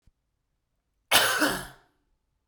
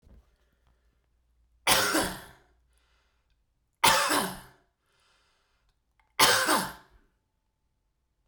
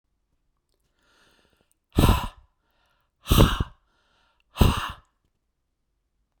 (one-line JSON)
{"cough_length": "2.5 s", "cough_amplitude": 18828, "cough_signal_mean_std_ratio": 0.35, "three_cough_length": "8.3 s", "three_cough_amplitude": 16396, "three_cough_signal_mean_std_ratio": 0.33, "exhalation_length": "6.4 s", "exhalation_amplitude": 24638, "exhalation_signal_mean_std_ratio": 0.27, "survey_phase": "beta (2021-08-13 to 2022-03-07)", "age": "45-64", "gender": "Male", "wearing_mask": "No", "symptom_none": true, "symptom_onset": "10 days", "smoker_status": "Never smoked", "respiratory_condition_asthma": false, "respiratory_condition_other": false, "recruitment_source": "REACT", "submission_delay": "1 day", "covid_test_result": "Negative", "covid_test_method": "RT-qPCR", "influenza_a_test_result": "Negative", "influenza_b_test_result": "Negative"}